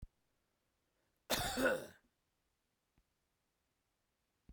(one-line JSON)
{"cough_length": "4.5 s", "cough_amplitude": 2614, "cough_signal_mean_std_ratio": 0.28, "survey_phase": "beta (2021-08-13 to 2022-03-07)", "age": "45-64", "gender": "Male", "wearing_mask": "No", "symptom_none": true, "smoker_status": "Never smoked", "respiratory_condition_asthma": false, "respiratory_condition_other": false, "recruitment_source": "REACT", "submission_delay": "3 days", "covid_test_result": "Negative", "covid_test_method": "RT-qPCR"}